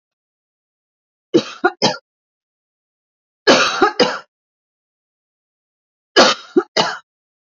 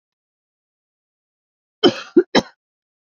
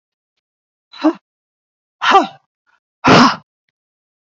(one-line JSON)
{"three_cough_length": "7.6 s", "three_cough_amplitude": 31796, "three_cough_signal_mean_std_ratio": 0.31, "cough_length": "3.1 s", "cough_amplitude": 28117, "cough_signal_mean_std_ratio": 0.21, "exhalation_length": "4.3 s", "exhalation_amplitude": 32767, "exhalation_signal_mean_std_ratio": 0.31, "survey_phase": "beta (2021-08-13 to 2022-03-07)", "age": "18-44", "gender": "Female", "wearing_mask": "No", "symptom_runny_or_blocked_nose": true, "symptom_fatigue": true, "symptom_onset": "6 days", "smoker_status": "Never smoked", "respiratory_condition_asthma": false, "respiratory_condition_other": false, "recruitment_source": "REACT", "submission_delay": "2 days", "covid_test_result": "Negative", "covid_test_method": "RT-qPCR"}